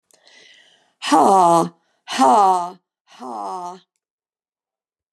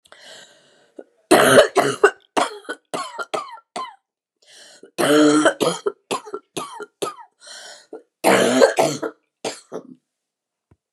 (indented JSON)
{
  "exhalation_length": "5.1 s",
  "exhalation_amplitude": 25890,
  "exhalation_signal_mean_std_ratio": 0.42,
  "three_cough_length": "10.9 s",
  "three_cough_amplitude": 32768,
  "three_cough_signal_mean_std_ratio": 0.41,
  "survey_phase": "beta (2021-08-13 to 2022-03-07)",
  "age": "65+",
  "gender": "Female",
  "wearing_mask": "No",
  "symptom_cough_any": true,
  "symptom_runny_or_blocked_nose": true,
  "symptom_shortness_of_breath": true,
  "symptom_sore_throat": true,
  "symptom_fatigue": true,
  "symptom_onset": "6 days",
  "smoker_status": "Ex-smoker",
  "respiratory_condition_asthma": false,
  "respiratory_condition_other": false,
  "recruitment_source": "Test and Trace",
  "submission_delay": "1 day",
  "covid_test_result": "Positive",
  "covid_test_method": "RT-qPCR"
}